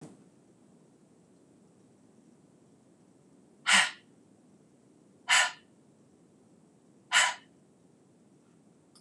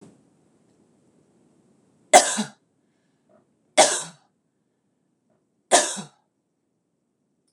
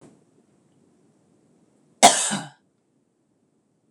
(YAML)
exhalation_length: 9.0 s
exhalation_amplitude: 12375
exhalation_signal_mean_std_ratio: 0.24
three_cough_length: 7.5 s
three_cough_amplitude: 26028
three_cough_signal_mean_std_ratio: 0.21
cough_length: 3.9 s
cough_amplitude: 26028
cough_signal_mean_std_ratio: 0.2
survey_phase: beta (2021-08-13 to 2022-03-07)
age: 45-64
gender: Female
wearing_mask: 'No'
symptom_none: true
smoker_status: Ex-smoker
respiratory_condition_asthma: false
respiratory_condition_other: false
recruitment_source: REACT
submission_delay: 1 day
covid_test_result: Negative
covid_test_method: RT-qPCR
influenza_a_test_result: Negative
influenza_b_test_result: Negative